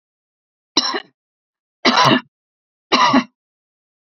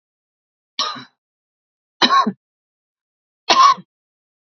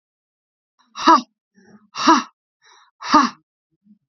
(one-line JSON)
{"cough_length": "4.0 s", "cough_amplitude": 30692, "cough_signal_mean_std_ratio": 0.37, "three_cough_length": "4.5 s", "three_cough_amplitude": 32768, "three_cough_signal_mean_std_ratio": 0.3, "exhalation_length": "4.1 s", "exhalation_amplitude": 29423, "exhalation_signal_mean_std_ratio": 0.3, "survey_phase": "beta (2021-08-13 to 2022-03-07)", "age": "45-64", "gender": "Female", "wearing_mask": "No", "symptom_fatigue": true, "symptom_headache": true, "smoker_status": "Never smoked", "respiratory_condition_asthma": true, "respiratory_condition_other": false, "recruitment_source": "REACT", "submission_delay": "1 day", "covid_test_result": "Negative", "covid_test_method": "RT-qPCR", "influenza_a_test_result": "Negative", "influenza_b_test_result": "Negative"}